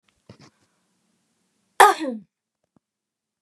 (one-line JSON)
{"three_cough_length": "3.4 s", "three_cough_amplitude": 32753, "three_cough_signal_mean_std_ratio": 0.19, "survey_phase": "beta (2021-08-13 to 2022-03-07)", "age": "45-64", "gender": "Female", "wearing_mask": "No", "symptom_cough_any": true, "symptom_fatigue": true, "smoker_status": "Never smoked", "respiratory_condition_asthma": false, "respiratory_condition_other": false, "recruitment_source": "REACT", "submission_delay": "6 days", "covid_test_result": "Negative", "covid_test_method": "RT-qPCR", "influenza_a_test_result": "Negative", "influenza_b_test_result": "Negative"}